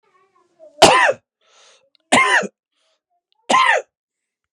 {"three_cough_length": "4.5 s", "three_cough_amplitude": 32768, "three_cough_signal_mean_std_ratio": 0.37, "survey_phase": "beta (2021-08-13 to 2022-03-07)", "age": "18-44", "gender": "Male", "wearing_mask": "No", "symptom_none": true, "smoker_status": "Ex-smoker", "respiratory_condition_asthma": false, "respiratory_condition_other": false, "recruitment_source": "REACT", "submission_delay": "1 day", "covid_test_result": "Negative", "covid_test_method": "RT-qPCR", "influenza_a_test_result": "Negative", "influenza_b_test_result": "Negative"}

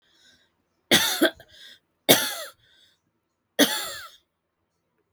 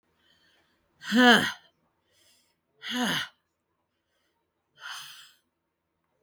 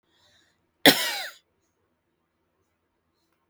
{"three_cough_length": "5.1 s", "three_cough_amplitude": 32766, "three_cough_signal_mean_std_ratio": 0.31, "exhalation_length": "6.2 s", "exhalation_amplitude": 15074, "exhalation_signal_mean_std_ratio": 0.27, "cough_length": "3.5 s", "cough_amplitude": 31486, "cough_signal_mean_std_ratio": 0.19, "survey_phase": "beta (2021-08-13 to 2022-03-07)", "age": "65+", "gender": "Male", "wearing_mask": "No", "symptom_new_continuous_cough": true, "symptom_runny_or_blocked_nose": true, "symptom_diarrhoea": true, "symptom_fatigue": true, "symptom_headache": true, "symptom_change_to_sense_of_smell_or_taste": true, "symptom_onset": "3 days", "smoker_status": "Ex-smoker", "respiratory_condition_asthma": true, "respiratory_condition_other": false, "recruitment_source": "Test and Trace", "submission_delay": "2 days", "covid_test_result": "Negative", "covid_test_method": "RT-qPCR"}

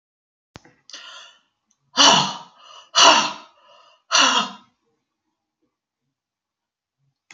{"exhalation_length": "7.3 s", "exhalation_amplitude": 30928, "exhalation_signal_mean_std_ratio": 0.3, "survey_phase": "beta (2021-08-13 to 2022-03-07)", "age": "65+", "gender": "Female", "wearing_mask": "No", "symptom_none": true, "smoker_status": "Never smoked", "respiratory_condition_asthma": false, "respiratory_condition_other": false, "recruitment_source": "REACT", "submission_delay": "1 day", "covid_test_result": "Negative", "covid_test_method": "RT-qPCR", "influenza_a_test_result": "Negative", "influenza_b_test_result": "Negative"}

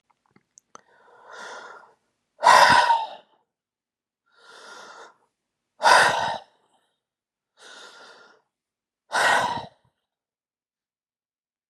{"exhalation_length": "11.7 s", "exhalation_amplitude": 26652, "exhalation_signal_mean_std_ratio": 0.3, "survey_phase": "alpha (2021-03-01 to 2021-08-12)", "age": "45-64", "gender": "Female", "wearing_mask": "No", "symptom_none": true, "smoker_status": "Never smoked", "respiratory_condition_asthma": false, "respiratory_condition_other": false, "recruitment_source": "Test and Trace", "submission_delay": "98 days", "covid_test_result": "Negative", "covid_test_method": "LFT"}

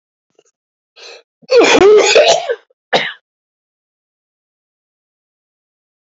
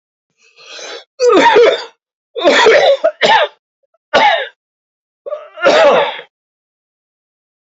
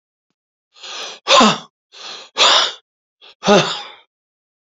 {"cough_length": "6.1 s", "cough_amplitude": 31044, "cough_signal_mean_std_ratio": 0.36, "three_cough_length": "7.7 s", "three_cough_amplitude": 28834, "three_cough_signal_mean_std_ratio": 0.51, "exhalation_length": "4.7 s", "exhalation_amplitude": 32767, "exhalation_signal_mean_std_ratio": 0.38, "survey_phase": "beta (2021-08-13 to 2022-03-07)", "age": "65+", "gender": "Male", "wearing_mask": "No", "symptom_cough_any": true, "symptom_runny_or_blocked_nose": true, "symptom_sore_throat": true, "smoker_status": "Ex-smoker", "respiratory_condition_asthma": false, "respiratory_condition_other": false, "recruitment_source": "Test and Trace", "submission_delay": "2 days", "covid_test_result": "Positive", "covid_test_method": "RT-qPCR", "covid_ct_value": 17.9, "covid_ct_gene": "S gene"}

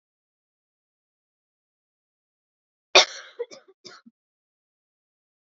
{"cough_length": "5.5 s", "cough_amplitude": 28683, "cough_signal_mean_std_ratio": 0.12, "survey_phase": "alpha (2021-03-01 to 2021-08-12)", "age": "18-44", "gender": "Female", "wearing_mask": "No", "symptom_cough_any": true, "symptom_fatigue": true, "symptom_headache": true, "symptom_change_to_sense_of_smell_or_taste": true, "symptom_onset": "3 days", "smoker_status": "Never smoked", "respiratory_condition_asthma": true, "respiratory_condition_other": false, "recruitment_source": "Test and Trace", "submission_delay": "2 days", "covid_test_result": "Positive", "covid_test_method": "RT-qPCR", "covid_ct_value": 14.5, "covid_ct_gene": "N gene", "covid_ct_mean": 14.8, "covid_viral_load": "14000000 copies/ml", "covid_viral_load_category": "High viral load (>1M copies/ml)"}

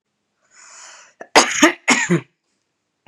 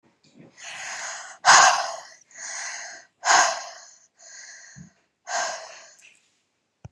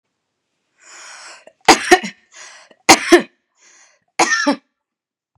{"cough_length": "3.1 s", "cough_amplitude": 32767, "cough_signal_mean_std_ratio": 0.34, "exhalation_length": "6.9 s", "exhalation_amplitude": 30240, "exhalation_signal_mean_std_ratio": 0.35, "three_cough_length": "5.4 s", "three_cough_amplitude": 32768, "three_cough_signal_mean_std_ratio": 0.29, "survey_phase": "beta (2021-08-13 to 2022-03-07)", "age": "18-44", "gender": "Female", "wearing_mask": "No", "symptom_none": true, "smoker_status": "Never smoked", "respiratory_condition_asthma": false, "respiratory_condition_other": false, "recruitment_source": "REACT", "submission_delay": "2 days", "covid_test_result": "Negative", "covid_test_method": "RT-qPCR", "influenza_a_test_result": "Negative", "influenza_b_test_result": "Negative"}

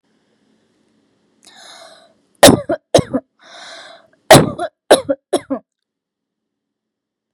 {"three_cough_length": "7.3 s", "three_cough_amplitude": 32768, "three_cough_signal_mean_std_ratio": 0.26, "survey_phase": "beta (2021-08-13 to 2022-03-07)", "age": "18-44", "gender": "Female", "wearing_mask": "No", "symptom_none": true, "smoker_status": "Never smoked", "respiratory_condition_asthma": false, "respiratory_condition_other": false, "recruitment_source": "REACT", "submission_delay": "3 days", "covid_test_result": "Negative", "covid_test_method": "RT-qPCR", "influenza_a_test_result": "Negative", "influenza_b_test_result": "Negative"}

